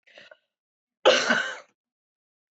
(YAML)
cough_length: 2.6 s
cough_amplitude: 17450
cough_signal_mean_std_ratio: 0.31
survey_phase: beta (2021-08-13 to 2022-03-07)
age: 45-64
gender: Female
wearing_mask: 'No'
symptom_sore_throat: true
smoker_status: Never smoked
respiratory_condition_asthma: false
respiratory_condition_other: false
recruitment_source: Test and Trace
submission_delay: 1 day
covid_test_result: Positive
covid_test_method: RT-qPCR
covid_ct_value: 18.8
covid_ct_gene: ORF1ab gene
covid_ct_mean: 19.3
covid_viral_load: 480000 copies/ml
covid_viral_load_category: Low viral load (10K-1M copies/ml)